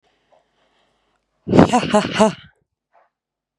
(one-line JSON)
{"exhalation_length": "3.6 s", "exhalation_amplitude": 32768, "exhalation_signal_mean_std_ratio": 0.32, "survey_phase": "beta (2021-08-13 to 2022-03-07)", "age": "18-44", "gender": "Female", "wearing_mask": "No", "symptom_none": true, "symptom_onset": "8 days", "smoker_status": "Never smoked", "respiratory_condition_asthma": false, "respiratory_condition_other": false, "recruitment_source": "REACT", "submission_delay": "3 days", "covid_test_result": "Negative", "covid_test_method": "RT-qPCR", "influenza_a_test_result": "Negative", "influenza_b_test_result": "Negative"}